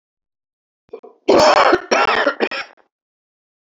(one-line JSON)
{"three_cough_length": "3.7 s", "three_cough_amplitude": 30628, "three_cough_signal_mean_std_ratio": 0.43, "survey_phase": "beta (2021-08-13 to 2022-03-07)", "age": "45-64", "gender": "Male", "wearing_mask": "No", "symptom_runny_or_blocked_nose": true, "symptom_onset": "10 days", "smoker_status": "Never smoked", "respiratory_condition_asthma": false, "respiratory_condition_other": false, "recruitment_source": "REACT", "submission_delay": "2 days", "covid_test_result": "Negative", "covid_test_method": "RT-qPCR", "influenza_a_test_result": "Negative", "influenza_b_test_result": "Negative"}